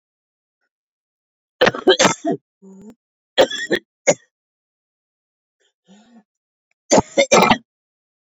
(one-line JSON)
{"three_cough_length": "8.3 s", "three_cough_amplitude": 29584, "three_cough_signal_mean_std_ratio": 0.3, "survey_phase": "beta (2021-08-13 to 2022-03-07)", "age": "45-64", "gender": "Female", "wearing_mask": "No", "symptom_cough_any": true, "symptom_runny_or_blocked_nose": true, "symptom_sore_throat": true, "symptom_diarrhoea": true, "symptom_fatigue": true, "symptom_other": true, "smoker_status": "Current smoker (1 to 10 cigarettes per day)", "respiratory_condition_asthma": false, "respiratory_condition_other": false, "recruitment_source": "Test and Trace", "submission_delay": "2 days", "covid_test_result": "Positive", "covid_test_method": "RT-qPCR", "covid_ct_value": 33.9, "covid_ct_gene": "ORF1ab gene"}